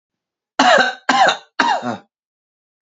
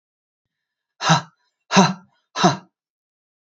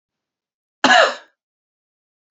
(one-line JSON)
{"three_cough_length": "2.8 s", "three_cough_amplitude": 31691, "three_cough_signal_mean_std_ratio": 0.47, "exhalation_length": "3.6 s", "exhalation_amplitude": 29379, "exhalation_signal_mean_std_ratio": 0.3, "cough_length": "2.3 s", "cough_amplitude": 28320, "cough_signal_mean_std_ratio": 0.28, "survey_phase": "alpha (2021-03-01 to 2021-08-12)", "age": "18-44", "gender": "Male", "wearing_mask": "No", "symptom_none": true, "smoker_status": "Ex-smoker", "respiratory_condition_asthma": false, "respiratory_condition_other": false, "recruitment_source": "REACT", "submission_delay": "1 day", "covid_test_result": "Negative", "covid_test_method": "RT-qPCR"}